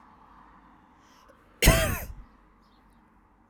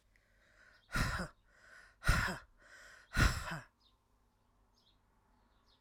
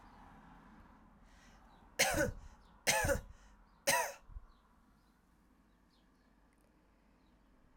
{"cough_length": "3.5 s", "cough_amplitude": 21961, "cough_signal_mean_std_ratio": 0.27, "exhalation_length": "5.8 s", "exhalation_amplitude": 5057, "exhalation_signal_mean_std_ratio": 0.34, "three_cough_length": "7.8 s", "three_cough_amplitude": 4966, "three_cough_signal_mean_std_ratio": 0.33, "survey_phase": "alpha (2021-03-01 to 2021-08-12)", "age": "45-64", "gender": "Female", "wearing_mask": "No", "symptom_cough_any": true, "symptom_headache": true, "symptom_onset": "3 days", "smoker_status": "Never smoked", "respiratory_condition_asthma": false, "respiratory_condition_other": false, "recruitment_source": "Test and Trace", "submission_delay": "2 days", "covid_test_result": "Positive", "covid_test_method": "RT-qPCR", "covid_ct_value": 12.3, "covid_ct_gene": "ORF1ab gene", "covid_ct_mean": 13.1, "covid_viral_load": "50000000 copies/ml", "covid_viral_load_category": "High viral load (>1M copies/ml)"}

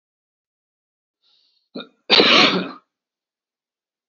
{"cough_length": "4.1 s", "cough_amplitude": 32767, "cough_signal_mean_std_ratio": 0.29, "survey_phase": "beta (2021-08-13 to 2022-03-07)", "age": "45-64", "gender": "Male", "wearing_mask": "No", "symptom_none": true, "smoker_status": "Never smoked", "respiratory_condition_asthma": false, "respiratory_condition_other": false, "recruitment_source": "REACT", "submission_delay": "3 days", "covid_test_result": "Negative", "covid_test_method": "RT-qPCR", "influenza_a_test_result": "Negative", "influenza_b_test_result": "Negative"}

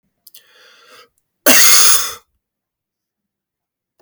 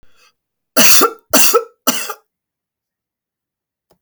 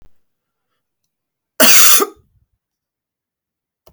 {"exhalation_length": "4.0 s", "exhalation_amplitude": 32768, "exhalation_signal_mean_std_ratio": 0.33, "three_cough_length": "4.0 s", "three_cough_amplitude": 32768, "three_cough_signal_mean_std_ratio": 0.36, "cough_length": "3.9 s", "cough_amplitude": 32768, "cough_signal_mean_std_ratio": 0.29, "survey_phase": "beta (2021-08-13 to 2022-03-07)", "age": "45-64", "gender": "Male", "wearing_mask": "No", "symptom_none": true, "smoker_status": "Never smoked", "respiratory_condition_asthma": false, "respiratory_condition_other": false, "recruitment_source": "REACT", "submission_delay": "2 days", "covid_test_result": "Negative", "covid_test_method": "RT-qPCR"}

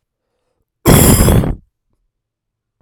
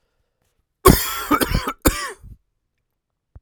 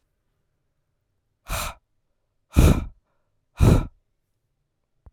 {"cough_length": "2.8 s", "cough_amplitude": 32768, "cough_signal_mean_std_ratio": 0.41, "three_cough_length": "3.4 s", "three_cough_amplitude": 32768, "three_cough_signal_mean_std_ratio": 0.34, "exhalation_length": "5.1 s", "exhalation_amplitude": 29879, "exhalation_signal_mean_std_ratio": 0.27, "survey_phase": "beta (2021-08-13 to 2022-03-07)", "age": "18-44", "gender": "Male", "wearing_mask": "No", "symptom_cough_any": true, "symptom_change_to_sense_of_smell_or_taste": true, "symptom_loss_of_taste": true, "symptom_onset": "4 days", "smoker_status": "Never smoked", "respiratory_condition_asthma": false, "respiratory_condition_other": false, "recruitment_source": "Test and Trace", "submission_delay": "3 days", "covid_test_result": "Positive", "covid_test_method": "RT-qPCR", "covid_ct_value": 19.8, "covid_ct_gene": "ORF1ab gene"}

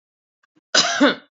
{"cough_length": "1.4 s", "cough_amplitude": 30001, "cough_signal_mean_std_ratio": 0.41, "survey_phase": "beta (2021-08-13 to 2022-03-07)", "age": "45-64", "gender": "Female", "wearing_mask": "No", "symptom_sore_throat": true, "symptom_onset": "3 days", "smoker_status": "Never smoked", "respiratory_condition_asthma": true, "respiratory_condition_other": false, "recruitment_source": "Test and Trace", "submission_delay": "2 days", "covid_test_result": "Positive", "covid_test_method": "RT-qPCR", "covid_ct_value": 25.9, "covid_ct_gene": "ORF1ab gene"}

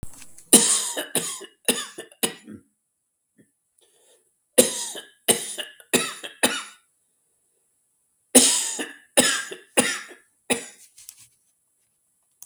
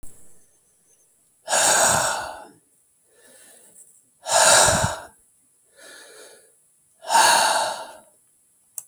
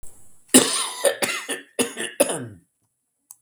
{"three_cough_length": "12.5 s", "three_cough_amplitude": 32767, "three_cough_signal_mean_std_ratio": 0.33, "exhalation_length": "8.9 s", "exhalation_amplitude": 29160, "exhalation_signal_mean_std_ratio": 0.42, "cough_length": "3.4 s", "cough_amplitude": 32768, "cough_signal_mean_std_ratio": 0.42, "survey_phase": "beta (2021-08-13 to 2022-03-07)", "age": "65+", "gender": "Male", "wearing_mask": "No", "symptom_none": true, "smoker_status": "Ex-smoker", "respiratory_condition_asthma": false, "respiratory_condition_other": true, "recruitment_source": "REACT", "submission_delay": "1 day", "covid_test_result": "Negative", "covid_test_method": "RT-qPCR", "influenza_a_test_result": "Negative", "influenza_b_test_result": "Negative"}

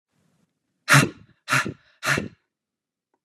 {"exhalation_length": "3.2 s", "exhalation_amplitude": 24769, "exhalation_signal_mean_std_ratio": 0.31, "survey_phase": "beta (2021-08-13 to 2022-03-07)", "age": "18-44", "gender": "Male", "wearing_mask": "No", "symptom_none": true, "smoker_status": "Never smoked", "respiratory_condition_asthma": false, "respiratory_condition_other": false, "recruitment_source": "REACT", "submission_delay": "1 day", "covid_test_result": "Negative", "covid_test_method": "RT-qPCR", "influenza_a_test_result": "Negative", "influenza_b_test_result": "Negative"}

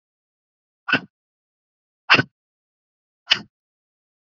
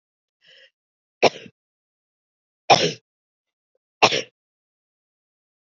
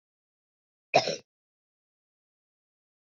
{"exhalation_length": "4.3 s", "exhalation_amplitude": 31178, "exhalation_signal_mean_std_ratio": 0.18, "three_cough_length": "5.6 s", "three_cough_amplitude": 29747, "three_cough_signal_mean_std_ratio": 0.2, "cough_length": "3.2 s", "cough_amplitude": 13640, "cough_signal_mean_std_ratio": 0.16, "survey_phase": "beta (2021-08-13 to 2022-03-07)", "age": "45-64", "gender": "Female", "wearing_mask": "No", "symptom_runny_or_blocked_nose": true, "smoker_status": "Never smoked", "respiratory_condition_asthma": false, "respiratory_condition_other": false, "recruitment_source": "Test and Trace", "submission_delay": "2 days", "covid_test_result": "Positive", "covid_test_method": "RT-qPCR", "covid_ct_value": 22.0, "covid_ct_gene": "ORF1ab gene"}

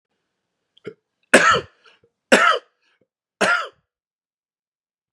{"three_cough_length": "5.1 s", "three_cough_amplitude": 32768, "three_cough_signal_mean_std_ratio": 0.3, "survey_phase": "beta (2021-08-13 to 2022-03-07)", "age": "18-44", "gender": "Male", "wearing_mask": "No", "symptom_none": true, "smoker_status": "Never smoked", "respiratory_condition_asthma": false, "respiratory_condition_other": false, "recruitment_source": "REACT", "submission_delay": "3 days", "covid_test_result": "Negative", "covid_test_method": "RT-qPCR", "influenza_a_test_result": "Negative", "influenza_b_test_result": "Negative"}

